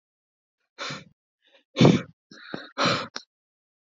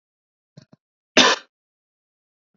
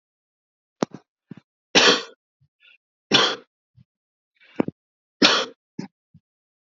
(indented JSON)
{
  "exhalation_length": "3.8 s",
  "exhalation_amplitude": 27417,
  "exhalation_signal_mean_std_ratio": 0.29,
  "cough_length": "2.6 s",
  "cough_amplitude": 30790,
  "cough_signal_mean_std_ratio": 0.21,
  "three_cough_length": "6.7 s",
  "three_cough_amplitude": 27293,
  "three_cough_signal_mean_std_ratio": 0.26,
  "survey_phase": "beta (2021-08-13 to 2022-03-07)",
  "age": "18-44",
  "gender": "Male",
  "wearing_mask": "No",
  "symptom_none": true,
  "smoker_status": "Never smoked",
  "respiratory_condition_asthma": false,
  "respiratory_condition_other": false,
  "recruitment_source": "REACT",
  "submission_delay": "1 day",
  "covid_test_result": "Negative",
  "covid_test_method": "RT-qPCR"
}